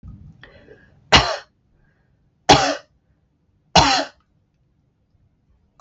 {"three_cough_length": "5.8 s", "three_cough_amplitude": 32768, "three_cough_signal_mean_std_ratio": 0.28, "survey_phase": "beta (2021-08-13 to 2022-03-07)", "age": "45-64", "gender": "Female", "wearing_mask": "No", "symptom_headache": true, "symptom_other": true, "smoker_status": "Ex-smoker", "respiratory_condition_asthma": false, "respiratory_condition_other": false, "recruitment_source": "REACT", "submission_delay": "2 days", "covid_test_result": "Negative", "covid_test_method": "RT-qPCR", "influenza_a_test_result": "Negative", "influenza_b_test_result": "Negative"}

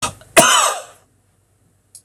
{"cough_length": "2.0 s", "cough_amplitude": 26028, "cough_signal_mean_std_ratio": 0.38, "survey_phase": "beta (2021-08-13 to 2022-03-07)", "age": "45-64", "gender": "Male", "wearing_mask": "No", "symptom_runny_or_blocked_nose": true, "smoker_status": "Never smoked", "respiratory_condition_asthma": false, "respiratory_condition_other": false, "recruitment_source": "REACT", "submission_delay": "1 day", "covid_test_result": "Negative", "covid_test_method": "RT-qPCR", "influenza_a_test_result": "Negative", "influenza_b_test_result": "Negative"}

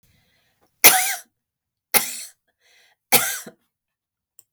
{"three_cough_length": "4.5 s", "three_cough_amplitude": 32768, "three_cough_signal_mean_std_ratio": 0.26, "survey_phase": "beta (2021-08-13 to 2022-03-07)", "age": "45-64", "gender": "Female", "wearing_mask": "No", "symptom_none": true, "smoker_status": "Ex-smoker", "respiratory_condition_asthma": false, "respiratory_condition_other": false, "recruitment_source": "REACT", "submission_delay": "4 days", "covid_test_result": "Negative", "covid_test_method": "RT-qPCR"}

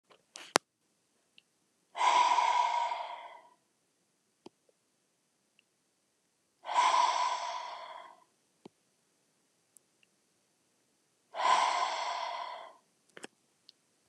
{"exhalation_length": "14.1 s", "exhalation_amplitude": 29122, "exhalation_signal_mean_std_ratio": 0.39, "survey_phase": "beta (2021-08-13 to 2022-03-07)", "age": "45-64", "gender": "Female", "wearing_mask": "No", "symptom_none": true, "smoker_status": "Never smoked", "respiratory_condition_asthma": false, "respiratory_condition_other": false, "recruitment_source": "REACT", "submission_delay": "0 days", "covid_test_result": "Negative", "covid_test_method": "RT-qPCR", "influenza_a_test_result": "Negative", "influenza_b_test_result": "Negative"}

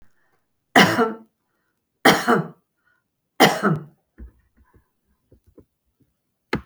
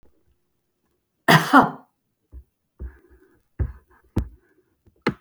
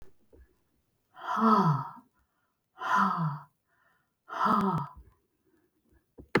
{"three_cough_length": "6.7 s", "three_cough_amplitude": 32768, "three_cough_signal_mean_std_ratio": 0.3, "cough_length": "5.2 s", "cough_amplitude": 32766, "cough_signal_mean_std_ratio": 0.25, "exhalation_length": "6.4 s", "exhalation_amplitude": 10285, "exhalation_signal_mean_std_ratio": 0.44, "survey_phase": "beta (2021-08-13 to 2022-03-07)", "age": "65+", "gender": "Female", "wearing_mask": "No", "symptom_none": true, "smoker_status": "Never smoked", "respiratory_condition_asthma": false, "respiratory_condition_other": false, "recruitment_source": "REACT", "submission_delay": "3 days", "covid_test_result": "Negative", "covid_test_method": "RT-qPCR", "influenza_a_test_result": "Negative", "influenza_b_test_result": "Negative"}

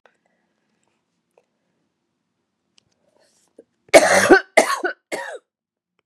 {"cough_length": "6.1 s", "cough_amplitude": 32768, "cough_signal_mean_std_ratio": 0.25, "survey_phase": "beta (2021-08-13 to 2022-03-07)", "age": "45-64", "gender": "Female", "wearing_mask": "No", "symptom_cough_any": true, "symptom_runny_or_blocked_nose": true, "symptom_fatigue": true, "symptom_headache": true, "symptom_change_to_sense_of_smell_or_taste": true, "symptom_onset": "2 days", "smoker_status": "Never smoked", "respiratory_condition_asthma": false, "respiratory_condition_other": false, "recruitment_source": "Test and Trace", "submission_delay": "2 days", "covid_test_result": "Positive", "covid_test_method": "RT-qPCR", "covid_ct_value": 14.9, "covid_ct_gene": "ORF1ab gene", "covid_ct_mean": 15.3, "covid_viral_load": "9800000 copies/ml", "covid_viral_load_category": "High viral load (>1M copies/ml)"}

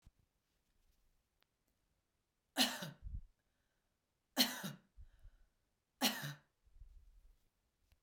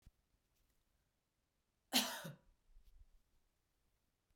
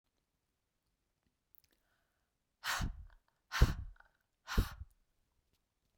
{"three_cough_length": "8.0 s", "three_cough_amplitude": 5271, "three_cough_signal_mean_std_ratio": 0.27, "cough_length": "4.4 s", "cough_amplitude": 3115, "cough_signal_mean_std_ratio": 0.21, "exhalation_length": "6.0 s", "exhalation_amplitude": 8461, "exhalation_signal_mean_std_ratio": 0.24, "survey_phase": "beta (2021-08-13 to 2022-03-07)", "age": "18-44", "gender": "Female", "wearing_mask": "No", "symptom_none": true, "smoker_status": "Never smoked", "respiratory_condition_asthma": false, "respiratory_condition_other": false, "recruitment_source": "Test and Trace", "submission_delay": "2 days", "covid_test_result": "Negative", "covid_test_method": "RT-qPCR"}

